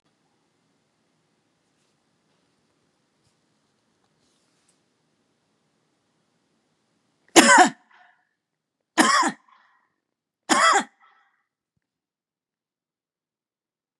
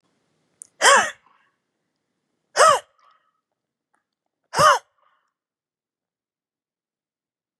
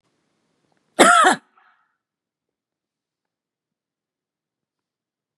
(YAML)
three_cough_length: 14.0 s
three_cough_amplitude: 32768
three_cough_signal_mean_std_ratio: 0.2
exhalation_length: 7.6 s
exhalation_amplitude: 28254
exhalation_signal_mean_std_ratio: 0.24
cough_length: 5.4 s
cough_amplitude: 32768
cough_signal_mean_std_ratio: 0.21
survey_phase: beta (2021-08-13 to 2022-03-07)
age: 65+
gender: Female
wearing_mask: 'No'
symptom_none: true
smoker_status: Never smoked
respiratory_condition_asthma: false
respiratory_condition_other: false
recruitment_source: REACT
submission_delay: 1 day
covid_test_result: Negative
covid_test_method: RT-qPCR
influenza_a_test_result: Negative
influenza_b_test_result: Negative